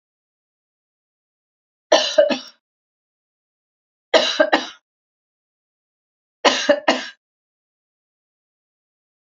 three_cough_length: 9.2 s
three_cough_amplitude: 32767
three_cough_signal_mean_std_ratio: 0.27
survey_phase: beta (2021-08-13 to 2022-03-07)
age: 45-64
gender: Female
wearing_mask: 'No'
symptom_none: true
smoker_status: Never smoked
respiratory_condition_asthma: false
respiratory_condition_other: false
recruitment_source: REACT
submission_delay: 1 day
covid_test_result: Negative
covid_test_method: RT-qPCR
influenza_a_test_result: Negative
influenza_b_test_result: Negative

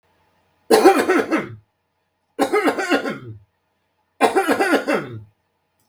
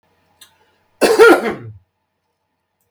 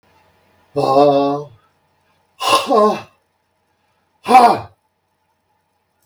three_cough_length: 5.9 s
three_cough_amplitude: 32768
three_cough_signal_mean_std_ratio: 0.48
cough_length: 2.9 s
cough_amplitude: 32768
cough_signal_mean_std_ratio: 0.32
exhalation_length: 6.1 s
exhalation_amplitude: 32768
exhalation_signal_mean_std_ratio: 0.39
survey_phase: beta (2021-08-13 to 2022-03-07)
age: 65+
gender: Male
wearing_mask: 'No'
symptom_none: true
symptom_onset: 13 days
smoker_status: Ex-smoker
respiratory_condition_asthma: false
respiratory_condition_other: false
recruitment_source: REACT
submission_delay: 2 days
covid_test_result: Negative
covid_test_method: RT-qPCR
influenza_a_test_result: Negative
influenza_b_test_result: Negative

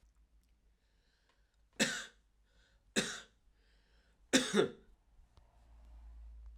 three_cough_length: 6.6 s
three_cough_amplitude: 7508
three_cough_signal_mean_std_ratio: 0.29
survey_phase: alpha (2021-03-01 to 2021-08-12)
age: 18-44
gender: Male
wearing_mask: 'No'
symptom_cough_any: true
symptom_fatigue: true
symptom_fever_high_temperature: true
symptom_headache: true
smoker_status: Never smoked
respiratory_condition_asthma: false
respiratory_condition_other: false
recruitment_source: Test and Trace
submission_delay: 1 day
covid_test_result: Positive
covid_test_method: RT-qPCR
covid_ct_value: 15.4
covid_ct_gene: ORF1ab gene
covid_ct_mean: 16.6
covid_viral_load: 3700000 copies/ml
covid_viral_load_category: High viral load (>1M copies/ml)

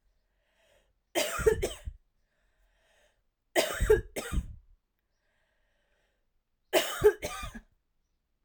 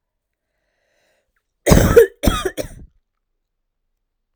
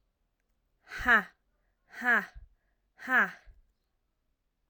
three_cough_length: 8.4 s
three_cough_amplitude: 10742
three_cough_signal_mean_std_ratio: 0.32
cough_length: 4.4 s
cough_amplitude: 32768
cough_signal_mean_std_ratio: 0.29
exhalation_length: 4.7 s
exhalation_amplitude: 9045
exhalation_signal_mean_std_ratio: 0.3
survey_phase: alpha (2021-03-01 to 2021-08-12)
age: 18-44
gender: Female
wearing_mask: 'No'
symptom_cough_any: true
symptom_fatigue: true
symptom_headache: true
symptom_change_to_sense_of_smell_or_taste: true
symptom_loss_of_taste: true
symptom_onset: 4 days
smoker_status: Never smoked
respiratory_condition_asthma: false
respiratory_condition_other: false
recruitment_source: Test and Trace
submission_delay: 2 days
covid_test_result: Positive
covid_test_method: RT-qPCR
covid_ct_value: 22.7
covid_ct_gene: ORF1ab gene
covid_ct_mean: 23.2
covid_viral_load: 24000 copies/ml
covid_viral_load_category: Low viral load (10K-1M copies/ml)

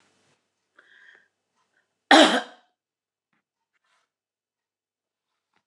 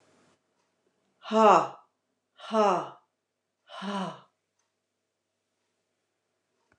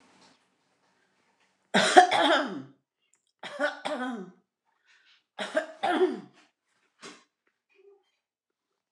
cough_length: 5.7 s
cough_amplitude: 28048
cough_signal_mean_std_ratio: 0.17
exhalation_length: 6.8 s
exhalation_amplitude: 16191
exhalation_signal_mean_std_ratio: 0.27
three_cough_length: 8.9 s
three_cough_amplitude: 27736
three_cough_signal_mean_std_ratio: 0.31
survey_phase: beta (2021-08-13 to 2022-03-07)
age: 65+
gender: Female
wearing_mask: 'No'
symptom_none: true
symptom_onset: 12 days
smoker_status: Never smoked
respiratory_condition_asthma: false
respiratory_condition_other: false
recruitment_source: REACT
submission_delay: 12 days
covid_test_result: Negative
covid_test_method: RT-qPCR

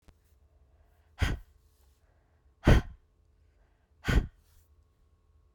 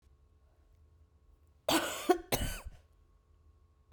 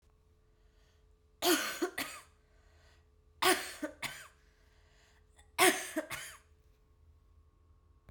exhalation_length: 5.5 s
exhalation_amplitude: 13434
exhalation_signal_mean_std_ratio: 0.24
cough_length: 3.9 s
cough_amplitude: 7796
cough_signal_mean_std_ratio: 0.33
three_cough_length: 8.1 s
three_cough_amplitude: 8224
three_cough_signal_mean_std_ratio: 0.32
survey_phase: beta (2021-08-13 to 2022-03-07)
age: 18-44
gender: Female
wearing_mask: 'No'
symptom_runny_or_blocked_nose: true
symptom_fatigue: true
symptom_headache: true
symptom_change_to_sense_of_smell_or_taste: true
symptom_loss_of_taste: true
symptom_other: true
symptom_onset: 6 days
smoker_status: Never smoked
respiratory_condition_asthma: false
respiratory_condition_other: false
recruitment_source: Test and Trace
submission_delay: 2 days
covid_test_result: Positive
covid_test_method: RT-qPCR
covid_ct_value: 15.8
covid_ct_gene: ORF1ab gene
covid_ct_mean: 16.0
covid_viral_load: 5500000 copies/ml
covid_viral_load_category: High viral load (>1M copies/ml)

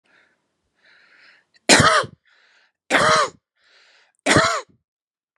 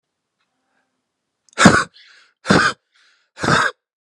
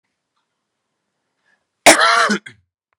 three_cough_length: 5.4 s
three_cough_amplitude: 32718
three_cough_signal_mean_std_ratio: 0.36
exhalation_length: 4.0 s
exhalation_amplitude: 32768
exhalation_signal_mean_std_ratio: 0.33
cough_length: 3.0 s
cough_amplitude: 32768
cough_signal_mean_std_ratio: 0.31
survey_phase: beta (2021-08-13 to 2022-03-07)
age: 45-64
gender: Male
wearing_mask: 'No'
symptom_none: true
symptom_onset: 4 days
smoker_status: Ex-smoker
respiratory_condition_asthma: false
respiratory_condition_other: false
recruitment_source: REACT
submission_delay: 4 days
covid_test_result: Negative
covid_test_method: RT-qPCR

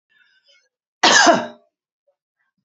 cough_length: 2.6 s
cough_amplitude: 31963
cough_signal_mean_std_ratio: 0.32
survey_phase: beta (2021-08-13 to 2022-03-07)
age: 65+
gender: Female
wearing_mask: 'No'
symptom_cough_any: true
symptom_runny_or_blocked_nose: true
symptom_shortness_of_breath: true
symptom_fatigue: true
symptom_onset: 5 days
smoker_status: Ex-smoker
respiratory_condition_asthma: true
respiratory_condition_other: false
recruitment_source: REACT
submission_delay: 1 day
covid_test_result: Negative
covid_test_method: RT-qPCR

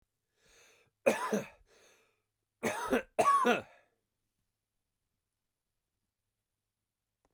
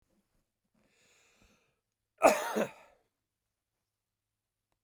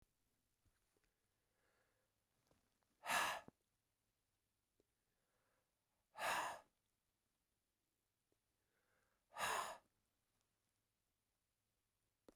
three_cough_length: 7.3 s
three_cough_amplitude: 6706
three_cough_signal_mean_std_ratio: 0.3
cough_length: 4.8 s
cough_amplitude: 14175
cough_signal_mean_std_ratio: 0.19
exhalation_length: 12.4 s
exhalation_amplitude: 1377
exhalation_signal_mean_std_ratio: 0.25
survey_phase: beta (2021-08-13 to 2022-03-07)
age: 45-64
gender: Male
wearing_mask: 'No'
symptom_none: true
smoker_status: Never smoked
respiratory_condition_asthma: false
respiratory_condition_other: false
recruitment_source: Test and Trace
submission_delay: 0 days
covid_test_result: Negative
covid_test_method: LFT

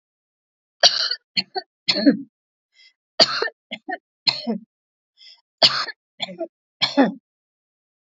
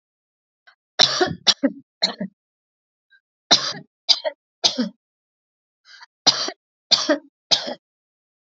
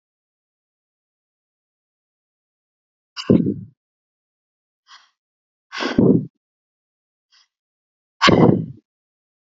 three_cough_length: 8.0 s
three_cough_amplitude: 32614
three_cough_signal_mean_std_ratio: 0.33
cough_length: 8.5 s
cough_amplitude: 32120
cough_signal_mean_std_ratio: 0.31
exhalation_length: 9.6 s
exhalation_amplitude: 28591
exhalation_signal_mean_std_ratio: 0.25
survey_phase: alpha (2021-03-01 to 2021-08-12)
age: 45-64
gender: Female
wearing_mask: 'No'
symptom_none: true
smoker_status: Never smoked
respiratory_condition_asthma: false
respiratory_condition_other: false
recruitment_source: REACT
submission_delay: 2 days
covid_test_result: Negative
covid_test_method: RT-qPCR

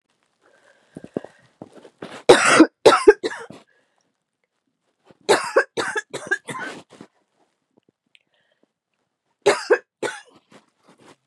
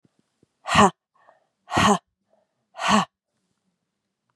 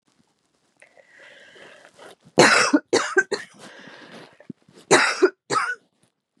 three_cough_length: 11.3 s
three_cough_amplitude: 32768
three_cough_signal_mean_std_ratio: 0.27
exhalation_length: 4.4 s
exhalation_amplitude: 28796
exhalation_signal_mean_std_ratio: 0.3
cough_length: 6.4 s
cough_amplitude: 32300
cough_signal_mean_std_ratio: 0.35
survey_phase: beta (2021-08-13 to 2022-03-07)
age: 45-64
gender: Female
wearing_mask: 'No'
symptom_cough_any: true
symptom_runny_or_blocked_nose: true
symptom_shortness_of_breath: true
symptom_sore_throat: true
symptom_headache: true
symptom_other: true
symptom_onset: 3 days
smoker_status: Never smoked
respiratory_condition_asthma: false
respiratory_condition_other: false
recruitment_source: Test and Trace
submission_delay: 2 days
covid_test_result: Positive
covid_test_method: RT-qPCR
covid_ct_value: 23.2
covid_ct_gene: ORF1ab gene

